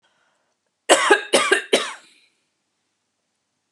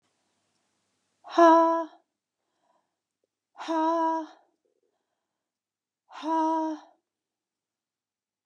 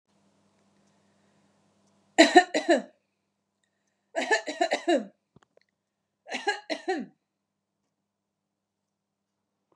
cough_length: 3.7 s
cough_amplitude: 32316
cough_signal_mean_std_ratio: 0.33
exhalation_length: 8.5 s
exhalation_amplitude: 13637
exhalation_signal_mean_std_ratio: 0.33
three_cough_length: 9.8 s
three_cough_amplitude: 28152
three_cough_signal_mean_std_ratio: 0.25
survey_phase: beta (2021-08-13 to 2022-03-07)
age: 45-64
gender: Female
wearing_mask: 'No'
symptom_none: true
smoker_status: Ex-smoker
respiratory_condition_asthma: false
respiratory_condition_other: false
recruitment_source: REACT
submission_delay: 1 day
covid_test_result: Negative
covid_test_method: RT-qPCR
influenza_a_test_result: Negative
influenza_b_test_result: Negative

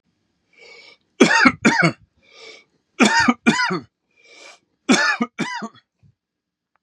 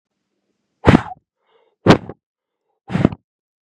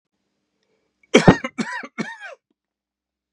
three_cough_length: 6.8 s
three_cough_amplitude: 32717
three_cough_signal_mean_std_ratio: 0.4
exhalation_length: 3.7 s
exhalation_amplitude: 32768
exhalation_signal_mean_std_ratio: 0.24
cough_length: 3.3 s
cough_amplitude: 32768
cough_signal_mean_std_ratio: 0.23
survey_phase: beta (2021-08-13 to 2022-03-07)
age: 45-64
gender: Male
wearing_mask: 'No'
symptom_runny_or_blocked_nose: true
symptom_sore_throat: true
symptom_onset: 12 days
smoker_status: Never smoked
respiratory_condition_asthma: false
respiratory_condition_other: false
recruitment_source: REACT
submission_delay: 0 days
covid_test_result: Negative
covid_test_method: RT-qPCR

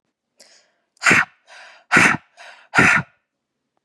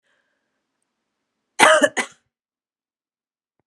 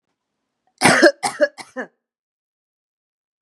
exhalation_length: 3.8 s
exhalation_amplitude: 31470
exhalation_signal_mean_std_ratio: 0.36
cough_length: 3.7 s
cough_amplitude: 32768
cough_signal_mean_std_ratio: 0.23
three_cough_length: 3.4 s
three_cough_amplitude: 32767
three_cough_signal_mean_std_ratio: 0.28
survey_phase: beta (2021-08-13 to 2022-03-07)
age: 18-44
gender: Female
wearing_mask: 'No'
symptom_none: true
smoker_status: Ex-smoker
respiratory_condition_asthma: false
respiratory_condition_other: false
recruitment_source: REACT
submission_delay: 1 day
covid_test_result: Negative
covid_test_method: RT-qPCR
influenza_a_test_result: Negative
influenza_b_test_result: Negative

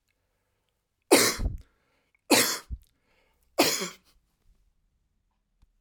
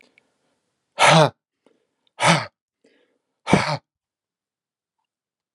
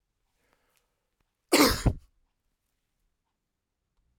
three_cough_length: 5.8 s
three_cough_amplitude: 23970
three_cough_signal_mean_std_ratio: 0.3
exhalation_length: 5.5 s
exhalation_amplitude: 30100
exhalation_signal_mean_std_ratio: 0.28
cough_length: 4.2 s
cough_amplitude: 16671
cough_signal_mean_std_ratio: 0.22
survey_phase: alpha (2021-03-01 to 2021-08-12)
age: 65+
gender: Male
wearing_mask: 'No'
symptom_cough_any: true
symptom_shortness_of_breath: true
symptom_fatigue: true
smoker_status: Ex-smoker
respiratory_condition_asthma: false
respiratory_condition_other: false
recruitment_source: REACT
submission_delay: 1 day
covid_test_result: Negative
covid_test_method: RT-qPCR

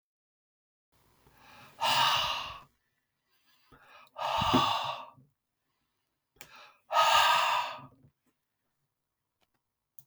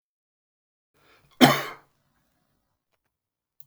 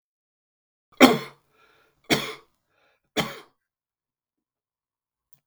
exhalation_length: 10.1 s
exhalation_amplitude: 8172
exhalation_signal_mean_std_ratio: 0.39
cough_length: 3.7 s
cough_amplitude: 31385
cough_signal_mean_std_ratio: 0.17
three_cough_length: 5.5 s
three_cough_amplitude: 32768
three_cough_signal_mean_std_ratio: 0.19
survey_phase: beta (2021-08-13 to 2022-03-07)
age: 45-64
gender: Male
wearing_mask: 'No'
symptom_cough_any: true
symptom_runny_or_blocked_nose: true
symptom_sore_throat: true
symptom_change_to_sense_of_smell_or_taste: true
symptom_loss_of_taste: true
symptom_other: true
symptom_onset: 3 days
smoker_status: Ex-smoker
respiratory_condition_asthma: false
respiratory_condition_other: false
recruitment_source: Test and Trace
submission_delay: 2 days
covid_test_result: Positive
covid_test_method: RT-qPCR
covid_ct_value: 18.3
covid_ct_gene: ORF1ab gene
covid_ct_mean: 18.5
covid_viral_load: 840000 copies/ml
covid_viral_load_category: Low viral load (10K-1M copies/ml)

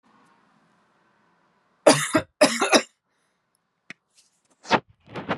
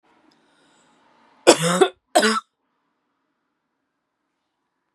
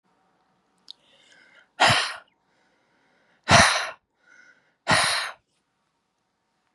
three_cough_length: 5.4 s
three_cough_amplitude: 26560
three_cough_signal_mean_std_ratio: 0.28
cough_length: 4.9 s
cough_amplitude: 32768
cough_signal_mean_std_ratio: 0.25
exhalation_length: 6.7 s
exhalation_amplitude: 26867
exhalation_signal_mean_std_ratio: 0.3
survey_phase: beta (2021-08-13 to 2022-03-07)
age: 18-44
gender: Female
wearing_mask: 'No'
symptom_none: true
smoker_status: Ex-smoker
respiratory_condition_asthma: false
respiratory_condition_other: false
recruitment_source: REACT
submission_delay: 0 days
covid_test_result: Negative
covid_test_method: RT-qPCR
influenza_a_test_result: Negative
influenza_b_test_result: Negative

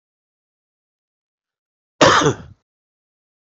cough_length: 3.6 s
cough_amplitude: 31146
cough_signal_mean_std_ratio: 0.24
survey_phase: beta (2021-08-13 to 2022-03-07)
age: 45-64
gender: Male
wearing_mask: 'No'
symptom_cough_any: true
symptom_runny_or_blocked_nose: true
symptom_fatigue: true
symptom_fever_high_temperature: true
symptom_onset: 3 days
smoker_status: Never smoked
respiratory_condition_asthma: true
respiratory_condition_other: false
recruitment_source: Test and Trace
submission_delay: 1 day
covid_test_result: Positive
covid_test_method: RT-qPCR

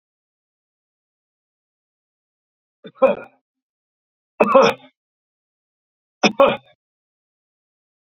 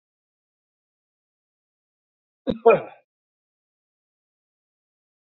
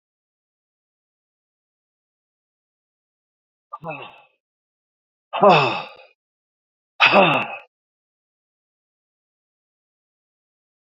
three_cough_length: 8.2 s
three_cough_amplitude: 29039
three_cough_signal_mean_std_ratio: 0.22
cough_length: 5.3 s
cough_amplitude: 23070
cough_signal_mean_std_ratio: 0.15
exhalation_length: 10.8 s
exhalation_amplitude: 27600
exhalation_signal_mean_std_ratio: 0.22
survey_phase: beta (2021-08-13 to 2022-03-07)
age: 65+
gender: Male
wearing_mask: 'No'
symptom_none: true
smoker_status: Ex-smoker
respiratory_condition_asthma: false
respiratory_condition_other: true
recruitment_source: REACT
submission_delay: 2 days
covid_test_result: Negative
covid_test_method: RT-qPCR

